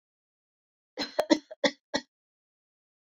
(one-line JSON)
{"three_cough_length": "3.1 s", "three_cough_amplitude": 13512, "three_cough_signal_mean_std_ratio": 0.23, "survey_phase": "beta (2021-08-13 to 2022-03-07)", "age": "45-64", "gender": "Female", "wearing_mask": "No", "symptom_cough_any": true, "symptom_runny_or_blocked_nose": true, "symptom_sore_throat": true, "symptom_fatigue": true, "symptom_fever_high_temperature": true, "symptom_headache": true, "smoker_status": "Prefer not to say", "respiratory_condition_asthma": false, "respiratory_condition_other": true, "recruitment_source": "Test and Trace", "submission_delay": "2 days", "covid_test_result": "Positive", "covid_test_method": "RT-qPCR", "covid_ct_value": 31.2, "covid_ct_gene": "ORF1ab gene"}